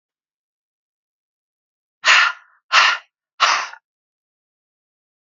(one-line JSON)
{"exhalation_length": "5.4 s", "exhalation_amplitude": 30307, "exhalation_signal_mean_std_ratio": 0.29, "survey_phase": "beta (2021-08-13 to 2022-03-07)", "age": "18-44", "gender": "Male", "wearing_mask": "No", "symptom_cough_any": true, "symptom_runny_or_blocked_nose": true, "symptom_abdominal_pain": true, "symptom_diarrhoea": true, "symptom_onset": "3 days", "smoker_status": "Ex-smoker", "respiratory_condition_asthma": true, "respiratory_condition_other": true, "recruitment_source": "REACT", "submission_delay": "0 days", "covid_test_result": "Negative", "covid_test_method": "RT-qPCR"}